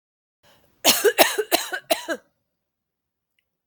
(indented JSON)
{
  "cough_length": "3.7 s",
  "cough_amplitude": 30324,
  "cough_signal_mean_std_ratio": 0.33,
  "survey_phase": "alpha (2021-03-01 to 2021-08-12)",
  "age": "45-64",
  "gender": "Female",
  "wearing_mask": "No",
  "symptom_cough_any": true,
  "smoker_status": "Ex-smoker",
  "respiratory_condition_asthma": true,
  "respiratory_condition_other": false,
  "recruitment_source": "REACT",
  "submission_delay": "2 days",
  "covid_test_result": "Negative",
  "covid_test_method": "RT-qPCR"
}